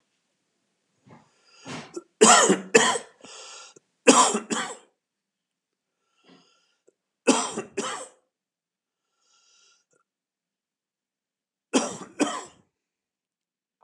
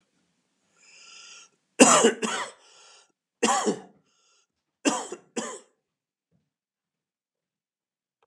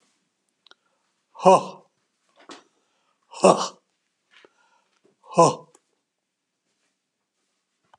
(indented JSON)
{
  "three_cough_length": "13.8 s",
  "three_cough_amplitude": 30652,
  "three_cough_signal_mean_std_ratio": 0.27,
  "cough_length": "8.3 s",
  "cough_amplitude": 31431,
  "cough_signal_mean_std_ratio": 0.27,
  "exhalation_length": "8.0 s",
  "exhalation_amplitude": 29710,
  "exhalation_signal_mean_std_ratio": 0.2,
  "survey_phase": "beta (2021-08-13 to 2022-03-07)",
  "age": "65+",
  "gender": "Male",
  "wearing_mask": "No",
  "symptom_sore_throat": true,
  "smoker_status": "Ex-smoker",
  "respiratory_condition_asthma": false,
  "respiratory_condition_other": false,
  "recruitment_source": "REACT",
  "submission_delay": "8 days",
  "covid_test_result": "Negative",
  "covid_test_method": "RT-qPCR"
}